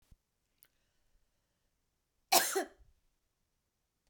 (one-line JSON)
{"cough_length": "4.1 s", "cough_amplitude": 10329, "cough_signal_mean_std_ratio": 0.2, "survey_phase": "beta (2021-08-13 to 2022-03-07)", "age": "45-64", "gender": "Female", "wearing_mask": "No", "symptom_change_to_sense_of_smell_or_taste": true, "smoker_status": "Current smoker (e-cigarettes or vapes only)", "respiratory_condition_asthma": false, "respiratory_condition_other": false, "recruitment_source": "REACT", "submission_delay": "1 day", "covid_test_result": "Negative", "covid_test_method": "RT-qPCR"}